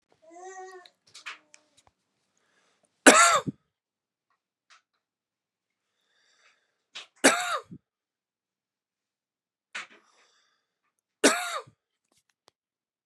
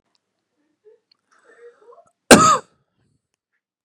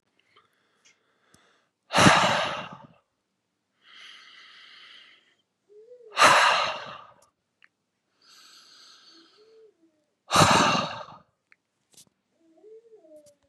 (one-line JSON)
{"three_cough_length": "13.1 s", "three_cough_amplitude": 32341, "three_cough_signal_mean_std_ratio": 0.2, "cough_length": "3.8 s", "cough_amplitude": 32768, "cough_signal_mean_std_ratio": 0.21, "exhalation_length": "13.5 s", "exhalation_amplitude": 26046, "exhalation_signal_mean_std_ratio": 0.3, "survey_phase": "beta (2021-08-13 to 2022-03-07)", "age": "18-44", "gender": "Male", "wearing_mask": "No", "symptom_none": true, "smoker_status": "Never smoked", "respiratory_condition_asthma": true, "respiratory_condition_other": false, "recruitment_source": "REACT", "submission_delay": "1 day", "covid_test_result": "Negative", "covid_test_method": "RT-qPCR", "influenza_a_test_result": "Negative", "influenza_b_test_result": "Negative"}